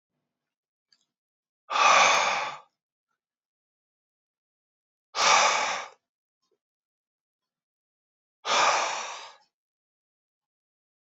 {
  "exhalation_length": "11.0 s",
  "exhalation_amplitude": 16393,
  "exhalation_signal_mean_std_ratio": 0.33,
  "survey_phase": "beta (2021-08-13 to 2022-03-07)",
  "age": "18-44",
  "gender": "Male",
  "wearing_mask": "No",
  "symptom_none": true,
  "smoker_status": "Never smoked",
  "respiratory_condition_asthma": false,
  "respiratory_condition_other": false,
  "recruitment_source": "Test and Trace",
  "submission_delay": "0 days",
  "covid_test_result": "Negative",
  "covid_test_method": "LFT"
}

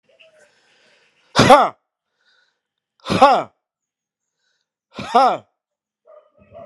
{
  "exhalation_length": "6.7 s",
  "exhalation_amplitude": 32768,
  "exhalation_signal_mean_std_ratio": 0.28,
  "survey_phase": "alpha (2021-03-01 to 2021-08-12)",
  "age": "45-64",
  "gender": "Male",
  "wearing_mask": "No",
  "symptom_cough_any": true,
  "symptom_fatigue": true,
  "symptom_headache": true,
  "symptom_change_to_sense_of_smell_or_taste": true,
  "symptom_loss_of_taste": true,
  "symptom_onset": "3 days",
  "smoker_status": "Ex-smoker",
  "respiratory_condition_asthma": false,
  "respiratory_condition_other": false,
  "recruitment_source": "Test and Trace",
  "submission_delay": "1 day",
  "covid_test_result": "Positive",
  "covid_test_method": "RT-qPCR"
}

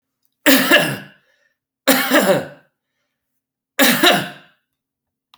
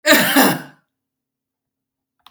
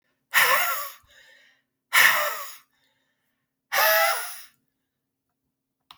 {
  "three_cough_length": "5.4 s",
  "three_cough_amplitude": 32768,
  "three_cough_signal_mean_std_ratio": 0.42,
  "cough_length": "2.3 s",
  "cough_amplitude": 32768,
  "cough_signal_mean_std_ratio": 0.38,
  "exhalation_length": "6.0 s",
  "exhalation_amplitude": 21191,
  "exhalation_signal_mean_std_ratio": 0.41,
  "survey_phase": "alpha (2021-03-01 to 2021-08-12)",
  "age": "65+",
  "gender": "Male",
  "wearing_mask": "No",
  "symptom_none": true,
  "smoker_status": "Current smoker (1 to 10 cigarettes per day)",
  "respiratory_condition_asthma": false,
  "respiratory_condition_other": false,
  "recruitment_source": "REACT",
  "submission_delay": "4 days",
  "covid_test_result": "Negative",
  "covid_test_method": "RT-qPCR"
}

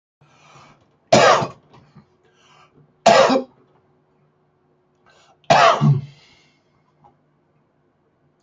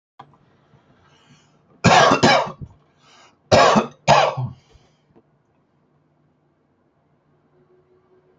{
  "three_cough_length": "8.4 s",
  "three_cough_amplitude": 30713,
  "three_cough_signal_mean_std_ratio": 0.31,
  "cough_length": "8.4 s",
  "cough_amplitude": 32381,
  "cough_signal_mean_std_ratio": 0.32,
  "survey_phase": "beta (2021-08-13 to 2022-03-07)",
  "age": "18-44",
  "gender": "Male",
  "wearing_mask": "No",
  "symptom_none": true,
  "smoker_status": "Ex-smoker",
  "respiratory_condition_asthma": true,
  "respiratory_condition_other": false,
  "recruitment_source": "REACT",
  "submission_delay": "1 day",
  "covid_test_method": "RT-qPCR"
}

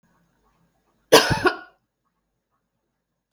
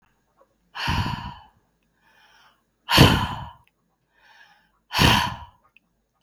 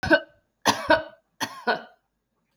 {
  "cough_length": "3.3 s",
  "cough_amplitude": 32768,
  "cough_signal_mean_std_ratio": 0.23,
  "exhalation_length": "6.2 s",
  "exhalation_amplitude": 32766,
  "exhalation_signal_mean_std_ratio": 0.33,
  "three_cough_length": "2.6 s",
  "three_cough_amplitude": 21134,
  "three_cough_signal_mean_std_ratio": 0.36,
  "survey_phase": "beta (2021-08-13 to 2022-03-07)",
  "age": "45-64",
  "gender": "Female",
  "wearing_mask": "No",
  "symptom_none": true,
  "smoker_status": "Never smoked",
  "respiratory_condition_asthma": false,
  "respiratory_condition_other": false,
  "recruitment_source": "REACT",
  "submission_delay": "3 days",
  "covid_test_result": "Negative",
  "covid_test_method": "RT-qPCR",
  "influenza_a_test_result": "Negative",
  "influenza_b_test_result": "Negative"
}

